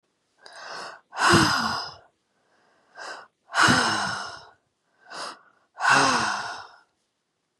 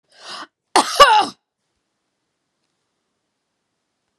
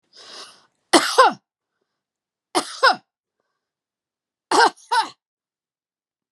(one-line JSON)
{"exhalation_length": "7.6 s", "exhalation_amplitude": 22954, "exhalation_signal_mean_std_ratio": 0.45, "cough_length": "4.2 s", "cough_amplitude": 32768, "cough_signal_mean_std_ratio": 0.25, "three_cough_length": "6.3 s", "three_cough_amplitude": 32767, "three_cough_signal_mean_std_ratio": 0.28, "survey_phase": "beta (2021-08-13 to 2022-03-07)", "age": "45-64", "gender": "Female", "wearing_mask": "No", "symptom_none": true, "smoker_status": "Never smoked", "respiratory_condition_asthma": false, "respiratory_condition_other": false, "recruitment_source": "REACT", "submission_delay": "6 days", "covid_test_result": "Negative", "covid_test_method": "RT-qPCR"}